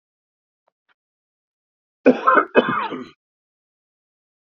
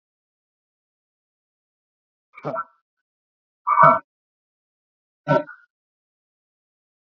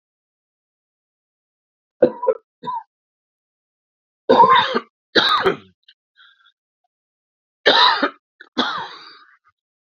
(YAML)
cough_length: 4.5 s
cough_amplitude: 32767
cough_signal_mean_std_ratio: 0.27
exhalation_length: 7.2 s
exhalation_amplitude: 27638
exhalation_signal_mean_std_ratio: 0.2
three_cough_length: 10.0 s
three_cough_amplitude: 30494
three_cough_signal_mean_std_ratio: 0.33
survey_phase: beta (2021-08-13 to 2022-03-07)
age: 45-64
gender: Male
wearing_mask: 'No'
symptom_cough_any: true
symptom_new_continuous_cough: true
symptom_runny_or_blocked_nose: true
symptom_sore_throat: true
symptom_fatigue: true
symptom_headache: true
symptom_onset: 2 days
smoker_status: Never smoked
respiratory_condition_asthma: false
respiratory_condition_other: true
recruitment_source: Test and Trace
submission_delay: 1 day
covid_test_result: Positive
covid_test_method: RT-qPCR
covid_ct_value: 15.7
covid_ct_gene: S gene
covid_ct_mean: 16.1
covid_viral_load: 5100000 copies/ml
covid_viral_load_category: High viral load (>1M copies/ml)